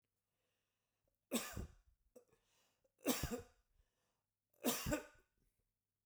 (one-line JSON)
{"three_cough_length": "6.1 s", "three_cough_amplitude": 2655, "three_cough_signal_mean_std_ratio": 0.32, "survey_phase": "beta (2021-08-13 to 2022-03-07)", "age": "65+", "gender": "Male", "wearing_mask": "No", "symptom_none": true, "smoker_status": "Never smoked", "respiratory_condition_asthma": false, "respiratory_condition_other": false, "recruitment_source": "REACT", "submission_delay": "2 days", "covid_test_result": "Negative", "covid_test_method": "RT-qPCR"}